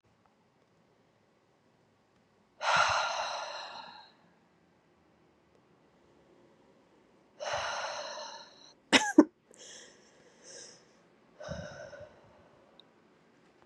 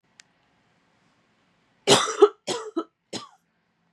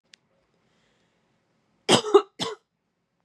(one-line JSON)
{"exhalation_length": "13.7 s", "exhalation_amplitude": 15410, "exhalation_signal_mean_std_ratio": 0.27, "three_cough_length": "3.9 s", "three_cough_amplitude": 25406, "three_cough_signal_mean_std_ratio": 0.25, "cough_length": "3.2 s", "cough_amplitude": 23380, "cough_signal_mean_std_ratio": 0.22, "survey_phase": "beta (2021-08-13 to 2022-03-07)", "age": "18-44", "gender": "Female", "wearing_mask": "No", "symptom_cough_any": true, "symptom_runny_or_blocked_nose": true, "symptom_sore_throat": true, "symptom_abdominal_pain": true, "symptom_fatigue": true, "symptom_other": true, "symptom_onset": "4 days", "smoker_status": "Never smoked", "respiratory_condition_asthma": false, "respiratory_condition_other": false, "recruitment_source": "Test and Trace", "submission_delay": "2 days", "covid_test_result": "Positive", "covid_test_method": "ePCR"}